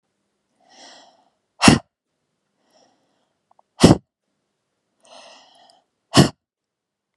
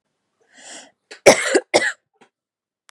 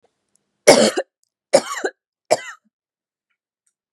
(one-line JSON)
{"exhalation_length": "7.2 s", "exhalation_amplitude": 32768, "exhalation_signal_mean_std_ratio": 0.19, "cough_length": "2.9 s", "cough_amplitude": 32768, "cough_signal_mean_std_ratio": 0.28, "three_cough_length": "3.9 s", "three_cough_amplitude": 32768, "three_cough_signal_mean_std_ratio": 0.27, "survey_phase": "beta (2021-08-13 to 2022-03-07)", "age": "18-44", "gender": "Female", "wearing_mask": "No", "symptom_sore_throat": true, "smoker_status": "Never smoked", "respiratory_condition_asthma": false, "respiratory_condition_other": false, "recruitment_source": "REACT", "submission_delay": "1 day", "covid_test_result": "Negative", "covid_test_method": "RT-qPCR"}